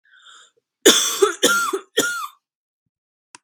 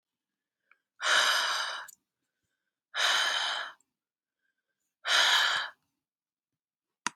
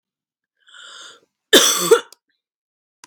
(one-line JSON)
{"three_cough_length": "3.4 s", "three_cough_amplitude": 32768, "three_cough_signal_mean_std_ratio": 0.41, "exhalation_length": "7.2 s", "exhalation_amplitude": 8786, "exhalation_signal_mean_std_ratio": 0.44, "cough_length": "3.1 s", "cough_amplitude": 32768, "cough_signal_mean_std_ratio": 0.29, "survey_phase": "beta (2021-08-13 to 2022-03-07)", "age": "18-44", "gender": "Female", "wearing_mask": "No", "symptom_cough_any": true, "symptom_runny_or_blocked_nose": true, "symptom_sore_throat": true, "symptom_fatigue": true, "symptom_headache": true, "smoker_status": "Never smoked", "respiratory_condition_asthma": false, "respiratory_condition_other": false, "recruitment_source": "Test and Trace", "submission_delay": "1 day", "covid_test_result": "Positive", "covid_test_method": "LFT"}